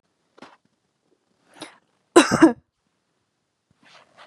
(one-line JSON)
{"cough_length": "4.3 s", "cough_amplitude": 32767, "cough_signal_mean_std_ratio": 0.2, "survey_phase": "beta (2021-08-13 to 2022-03-07)", "age": "18-44", "gender": "Female", "wearing_mask": "No", "symptom_none": true, "symptom_onset": "8 days", "smoker_status": "Never smoked", "respiratory_condition_asthma": false, "respiratory_condition_other": false, "recruitment_source": "REACT", "submission_delay": "2 days", "covid_test_result": "Negative", "covid_test_method": "RT-qPCR", "influenza_a_test_result": "Negative", "influenza_b_test_result": "Negative"}